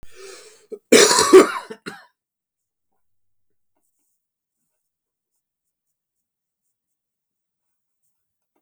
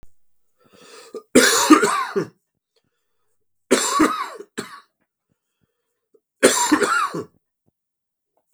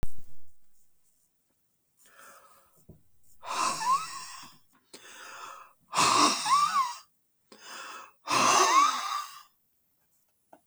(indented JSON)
{
  "cough_length": "8.6 s",
  "cough_amplitude": 32768,
  "cough_signal_mean_std_ratio": 0.2,
  "three_cough_length": "8.5 s",
  "three_cough_amplitude": 32768,
  "three_cough_signal_mean_std_ratio": 0.38,
  "exhalation_length": "10.7 s",
  "exhalation_amplitude": 11365,
  "exhalation_signal_mean_std_ratio": 0.48,
  "survey_phase": "beta (2021-08-13 to 2022-03-07)",
  "age": "45-64",
  "gender": "Male",
  "wearing_mask": "No",
  "symptom_cough_any": true,
  "symptom_runny_or_blocked_nose": true,
  "symptom_change_to_sense_of_smell_or_taste": true,
  "symptom_onset": "9 days",
  "smoker_status": "Never smoked",
  "respiratory_condition_asthma": false,
  "respiratory_condition_other": false,
  "recruitment_source": "Test and Trace",
  "submission_delay": "2 days",
  "covid_test_result": "Positive",
  "covid_test_method": "RT-qPCR",
  "covid_ct_value": 25.3,
  "covid_ct_gene": "ORF1ab gene",
  "covid_ct_mean": 25.8,
  "covid_viral_load": "3500 copies/ml",
  "covid_viral_load_category": "Minimal viral load (< 10K copies/ml)"
}